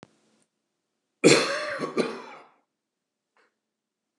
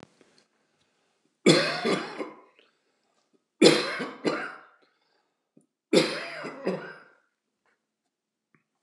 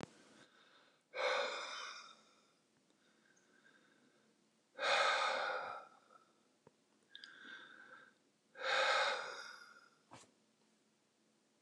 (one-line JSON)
{"cough_length": "4.2 s", "cough_amplitude": 25014, "cough_signal_mean_std_ratio": 0.29, "three_cough_length": "8.8 s", "three_cough_amplitude": 26373, "three_cough_signal_mean_std_ratio": 0.32, "exhalation_length": "11.6 s", "exhalation_amplitude": 2798, "exhalation_signal_mean_std_ratio": 0.41, "survey_phase": "beta (2021-08-13 to 2022-03-07)", "age": "65+", "gender": "Male", "wearing_mask": "No", "symptom_none": true, "smoker_status": "Never smoked", "respiratory_condition_asthma": false, "respiratory_condition_other": false, "recruitment_source": "REACT", "submission_delay": "3 days", "covid_test_result": "Negative", "covid_test_method": "RT-qPCR"}